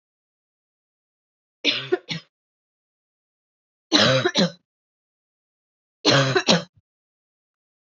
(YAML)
three_cough_length: 7.9 s
three_cough_amplitude: 25902
three_cough_signal_mean_std_ratio: 0.32
survey_phase: beta (2021-08-13 to 2022-03-07)
age: 18-44
gender: Female
wearing_mask: 'No'
symptom_cough_any: true
symptom_runny_or_blocked_nose: true
symptom_fatigue: true
symptom_fever_high_temperature: true
symptom_headache: true
symptom_change_to_sense_of_smell_or_taste: true
symptom_other: true
smoker_status: Never smoked
respiratory_condition_asthma: false
respiratory_condition_other: false
recruitment_source: Test and Trace
submission_delay: 2 days
covid_test_result: Positive
covid_test_method: RT-qPCR
covid_ct_value: 16.3
covid_ct_gene: ORF1ab gene
covid_ct_mean: 16.7
covid_viral_load: 3400000 copies/ml
covid_viral_load_category: High viral load (>1M copies/ml)